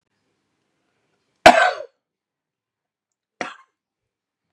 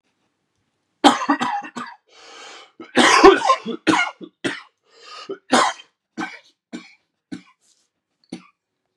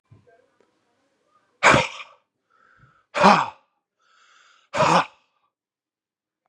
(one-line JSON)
{"cough_length": "4.5 s", "cough_amplitude": 32768, "cough_signal_mean_std_ratio": 0.18, "three_cough_length": "9.0 s", "three_cough_amplitude": 32768, "three_cough_signal_mean_std_ratio": 0.34, "exhalation_length": "6.5 s", "exhalation_amplitude": 32764, "exhalation_signal_mean_std_ratio": 0.28, "survey_phase": "beta (2021-08-13 to 2022-03-07)", "age": "45-64", "gender": "Male", "wearing_mask": "No", "symptom_cough_any": true, "symptom_fatigue": true, "symptom_headache": true, "smoker_status": "Ex-smoker", "respiratory_condition_asthma": false, "respiratory_condition_other": false, "recruitment_source": "Test and Trace", "submission_delay": "1 day", "covid_test_result": "Positive", "covid_test_method": "RT-qPCR", "covid_ct_value": 24.4, "covid_ct_gene": "ORF1ab gene", "covid_ct_mean": 24.5, "covid_viral_load": "9100 copies/ml", "covid_viral_load_category": "Minimal viral load (< 10K copies/ml)"}